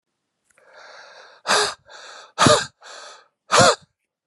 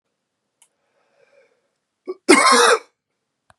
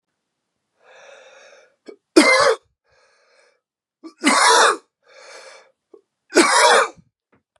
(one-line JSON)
{"exhalation_length": "4.3 s", "exhalation_amplitude": 32768, "exhalation_signal_mean_std_ratio": 0.35, "cough_length": "3.6 s", "cough_amplitude": 32753, "cough_signal_mean_std_ratio": 0.31, "three_cough_length": "7.6 s", "three_cough_amplitude": 32768, "three_cough_signal_mean_std_ratio": 0.37, "survey_phase": "beta (2021-08-13 to 2022-03-07)", "age": "45-64", "gender": "Male", "wearing_mask": "No", "symptom_cough_any": true, "symptom_runny_or_blocked_nose": true, "symptom_fatigue": true, "symptom_headache": true, "smoker_status": "Ex-smoker", "respiratory_condition_asthma": false, "respiratory_condition_other": false, "recruitment_source": "Test and Trace", "submission_delay": "2 days", "covid_test_result": "Positive", "covid_test_method": "RT-qPCR", "covid_ct_value": 20.1, "covid_ct_gene": "ORF1ab gene"}